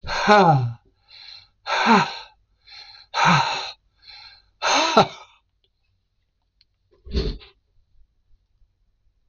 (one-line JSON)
{"exhalation_length": "9.3 s", "exhalation_amplitude": 26028, "exhalation_signal_mean_std_ratio": 0.39, "survey_phase": "beta (2021-08-13 to 2022-03-07)", "age": "65+", "gender": "Male", "wearing_mask": "No", "symptom_cough_any": true, "smoker_status": "Ex-smoker", "respiratory_condition_asthma": true, "respiratory_condition_other": false, "recruitment_source": "REACT", "submission_delay": "4 days", "covid_test_result": "Negative", "covid_test_method": "RT-qPCR", "influenza_a_test_result": "Negative", "influenza_b_test_result": "Negative"}